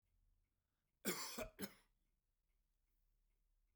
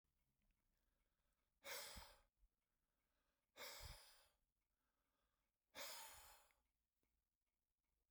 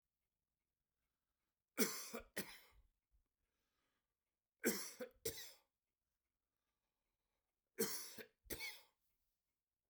{
  "cough_length": "3.8 s",
  "cough_amplitude": 1378,
  "cough_signal_mean_std_ratio": 0.3,
  "exhalation_length": "8.1 s",
  "exhalation_amplitude": 272,
  "exhalation_signal_mean_std_ratio": 0.37,
  "three_cough_length": "9.9 s",
  "three_cough_amplitude": 2374,
  "three_cough_signal_mean_std_ratio": 0.28,
  "survey_phase": "beta (2021-08-13 to 2022-03-07)",
  "age": "65+",
  "gender": "Male",
  "wearing_mask": "No",
  "symptom_none": true,
  "smoker_status": "Never smoked",
  "respiratory_condition_asthma": false,
  "respiratory_condition_other": false,
  "recruitment_source": "REACT",
  "submission_delay": "2 days",
  "covid_test_result": "Negative",
  "covid_test_method": "RT-qPCR"
}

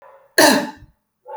{
  "cough_length": "1.4 s",
  "cough_amplitude": 30480,
  "cough_signal_mean_std_ratio": 0.38,
  "survey_phase": "alpha (2021-03-01 to 2021-08-12)",
  "age": "18-44",
  "gender": "Female",
  "wearing_mask": "No",
  "symptom_none": true,
  "smoker_status": "Ex-smoker",
  "respiratory_condition_asthma": false,
  "respiratory_condition_other": false,
  "recruitment_source": "REACT",
  "submission_delay": "1 day",
  "covid_test_result": "Negative",
  "covid_test_method": "RT-qPCR"
}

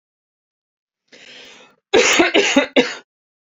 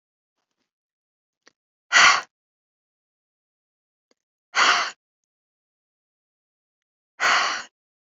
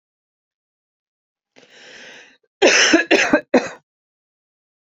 {
  "cough_length": "3.5 s",
  "cough_amplitude": 29111,
  "cough_signal_mean_std_ratio": 0.4,
  "exhalation_length": "8.1 s",
  "exhalation_amplitude": 25029,
  "exhalation_signal_mean_std_ratio": 0.26,
  "three_cough_length": "4.9 s",
  "three_cough_amplitude": 31230,
  "three_cough_signal_mean_std_ratio": 0.33,
  "survey_phase": "beta (2021-08-13 to 2022-03-07)",
  "age": "18-44",
  "gender": "Female",
  "wearing_mask": "No",
  "symptom_runny_or_blocked_nose": true,
  "smoker_status": "Ex-smoker",
  "respiratory_condition_asthma": false,
  "respiratory_condition_other": false,
  "recruitment_source": "REACT",
  "submission_delay": "1 day",
  "covid_test_result": "Negative",
  "covid_test_method": "RT-qPCR"
}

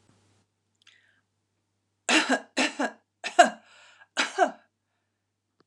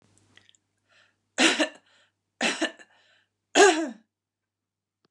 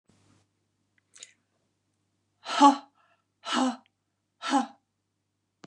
{
  "cough_length": "5.7 s",
  "cough_amplitude": 25797,
  "cough_signal_mean_std_ratio": 0.28,
  "three_cough_length": "5.1 s",
  "three_cough_amplitude": 22419,
  "three_cough_signal_mean_std_ratio": 0.29,
  "exhalation_length": "5.7 s",
  "exhalation_amplitude": 20002,
  "exhalation_signal_mean_std_ratio": 0.24,
  "survey_phase": "alpha (2021-03-01 to 2021-08-12)",
  "age": "45-64",
  "gender": "Female",
  "wearing_mask": "No",
  "symptom_none": true,
  "symptom_onset": "5 days",
  "smoker_status": "Never smoked",
  "respiratory_condition_asthma": false,
  "respiratory_condition_other": false,
  "recruitment_source": "REACT",
  "submission_delay": "1 day",
  "covid_test_result": "Negative",
  "covid_test_method": "RT-qPCR"
}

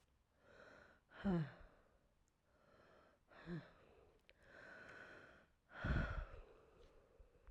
{
  "exhalation_length": "7.5 s",
  "exhalation_amplitude": 1237,
  "exhalation_signal_mean_std_ratio": 0.38,
  "survey_phase": "alpha (2021-03-01 to 2021-08-12)",
  "age": "18-44",
  "gender": "Female",
  "wearing_mask": "No",
  "symptom_cough_any": true,
  "symptom_shortness_of_breath": true,
  "symptom_diarrhoea": true,
  "symptom_fatigue": true,
  "symptom_fever_high_temperature": true,
  "symptom_headache": true,
  "symptom_onset": "4 days",
  "smoker_status": "Never smoked",
  "respiratory_condition_asthma": true,
  "respiratory_condition_other": false,
  "recruitment_source": "Test and Trace",
  "submission_delay": "2 days",
  "covid_test_result": "Positive",
  "covid_test_method": "RT-qPCR"
}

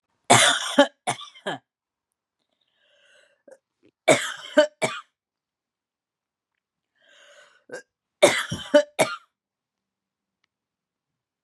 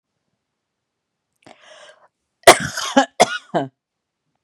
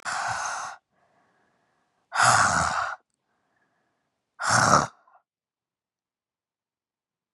{
  "three_cough_length": "11.4 s",
  "three_cough_amplitude": 31598,
  "three_cough_signal_mean_std_ratio": 0.27,
  "cough_length": "4.4 s",
  "cough_amplitude": 32768,
  "cough_signal_mean_std_ratio": 0.24,
  "exhalation_length": "7.3 s",
  "exhalation_amplitude": 25662,
  "exhalation_signal_mean_std_ratio": 0.37,
  "survey_phase": "beta (2021-08-13 to 2022-03-07)",
  "age": "18-44",
  "gender": "Female",
  "wearing_mask": "No",
  "symptom_cough_any": true,
  "symptom_runny_or_blocked_nose": true,
  "symptom_sore_throat": true,
  "symptom_fatigue": true,
  "symptom_headache": true,
  "symptom_onset": "4 days",
  "smoker_status": "Never smoked",
  "respiratory_condition_asthma": false,
  "respiratory_condition_other": false,
  "recruitment_source": "Test and Trace",
  "submission_delay": "2 days",
  "covid_test_result": "Positive",
  "covid_test_method": "RT-qPCR",
  "covid_ct_value": 28.6,
  "covid_ct_gene": "N gene"
}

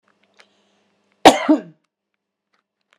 {
  "cough_length": "3.0 s",
  "cough_amplitude": 32768,
  "cough_signal_mean_std_ratio": 0.21,
  "survey_phase": "beta (2021-08-13 to 2022-03-07)",
  "age": "45-64",
  "gender": "Female",
  "wearing_mask": "No",
  "symptom_none": true,
  "smoker_status": "Ex-smoker",
  "respiratory_condition_asthma": false,
  "respiratory_condition_other": true,
  "recruitment_source": "REACT",
  "submission_delay": "2 days",
  "covid_test_result": "Negative",
  "covid_test_method": "RT-qPCR"
}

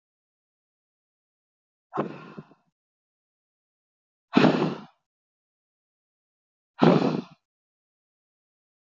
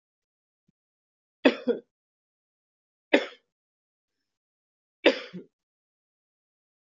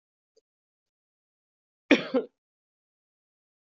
{
  "exhalation_length": "9.0 s",
  "exhalation_amplitude": 20193,
  "exhalation_signal_mean_std_ratio": 0.23,
  "three_cough_length": "6.8 s",
  "three_cough_amplitude": 24466,
  "three_cough_signal_mean_std_ratio": 0.17,
  "cough_length": "3.8 s",
  "cough_amplitude": 20567,
  "cough_signal_mean_std_ratio": 0.17,
  "survey_phase": "alpha (2021-03-01 to 2021-08-12)",
  "age": "18-44",
  "gender": "Male",
  "wearing_mask": "No",
  "symptom_none": true,
  "smoker_status": "Never smoked",
  "respiratory_condition_asthma": false,
  "respiratory_condition_other": false,
  "recruitment_source": "REACT",
  "submission_delay": "1 day",
  "covid_test_result": "Negative",
  "covid_test_method": "RT-qPCR"
}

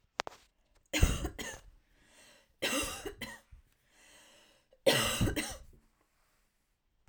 {
  "three_cough_length": "7.1 s",
  "three_cough_amplitude": 10009,
  "three_cough_signal_mean_std_ratio": 0.36,
  "survey_phase": "alpha (2021-03-01 to 2021-08-12)",
  "age": "18-44",
  "gender": "Female",
  "wearing_mask": "No",
  "symptom_none": true,
  "smoker_status": "Never smoked",
  "respiratory_condition_asthma": false,
  "respiratory_condition_other": false,
  "recruitment_source": "REACT",
  "submission_delay": "1 day",
  "covid_test_result": "Negative",
  "covid_test_method": "RT-qPCR"
}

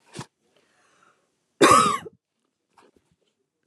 {
  "cough_length": "3.7 s",
  "cough_amplitude": 25780,
  "cough_signal_mean_std_ratio": 0.26,
  "survey_phase": "beta (2021-08-13 to 2022-03-07)",
  "age": "18-44",
  "gender": "Female",
  "wearing_mask": "Yes",
  "symptom_abdominal_pain": true,
  "symptom_fatigue": true,
  "symptom_headache": true,
  "smoker_status": "Never smoked",
  "respiratory_condition_asthma": true,
  "respiratory_condition_other": false,
  "recruitment_source": "REACT",
  "submission_delay": "4 days",
  "covid_test_result": "Negative",
  "covid_test_method": "RT-qPCR",
  "influenza_a_test_result": "Negative",
  "influenza_b_test_result": "Negative"
}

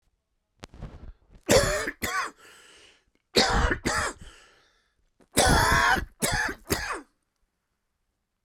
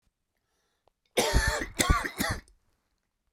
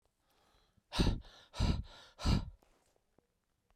{
  "three_cough_length": "8.4 s",
  "three_cough_amplitude": 21572,
  "three_cough_signal_mean_std_ratio": 0.45,
  "cough_length": "3.3 s",
  "cough_amplitude": 13185,
  "cough_signal_mean_std_ratio": 0.42,
  "exhalation_length": "3.8 s",
  "exhalation_amplitude": 4669,
  "exhalation_signal_mean_std_ratio": 0.37,
  "survey_phase": "beta (2021-08-13 to 2022-03-07)",
  "age": "45-64",
  "gender": "Male",
  "wearing_mask": "No",
  "symptom_cough_any": true,
  "symptom_runny_or_blocked_nose": true,
  "symptom_shortness_of_breath": true,
  "symptom_fatigue": true,
  "symptom_headache": true,
  "symptom_change_to_sense_of_smell_or_taste": true,
  "symptom_loss_of_taste": true,
  "symptom_onset": "5 days",
  "smoker_status": "Never smoked",
  "respiratory_condition_asthma": false,
  "respiratory_condition_other": false,
  "recruitment_source": "Test and Trace",
  "submission_delay": "2 days",
  "covid_test_result": "Positive",
  "covid_test_method": "RT-qPCR",
  "covid_ct_value": 16.0,
  "covid_ct_gene": "ORF1ab gene",
  "covid_ct_mean": 16.2,
  "covid_viral_load": "4800000 copies/ml",
  "covid_viral_load_category": "High viral load (>1M copies/ml)"
}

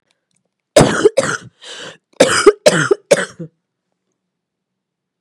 {
  "cough_length": "5.2 s",
  "cough_amplitude": 32768,
  "cough_signal_mean_std_ratio": 0.35,
  "survey_phase": "beta (2021-08-13 to 2022-03-07)",
  "age": "18-44",
  "gender": "Female",
  "wearing_mask": "No",
  "symptom_cough_any": true,
  "symptom_new_continuous_cough": true,
  "symptom_runny_or_blocked_nose": true,
  "symptom_fatigue": true,
  "symptom_headache": true,
  "symptom_onset": "2 days",
  "smoker_status": "Never smoked",
  "respiratory_condition_asthma": true,
  "respiratory_condition_other": false,
  "recruitment_source": "Test and Trace",
  "submission_delay": "1 day",
  "covid_test_result": "Positive",
  "covid_test_method": "RT-qPCR",
  "covid_ct_value": 26.8,
  "covid_ct_gene": "N gene"
}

